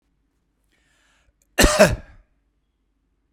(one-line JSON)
{"cough_length": "3.3 s", "cough_amplitude": 32767, "cough_signal_mean_std_ratio": 0.25, "survey_phase": "beta (2021-08-13 to 2022-03-07)", "age": "45-64", "gender": "Male", "wearing_mask": "No", "symptom_none": true, "smoker_status": "Never smoked", "respiratory_condition_asthma": false, "respiratory_condition_other": false, "recruitment_source": "Test and Trace", "submission_delay": "4 days", "covid_test_result": "Negative", "covid_test_method": "RT-qPCR"}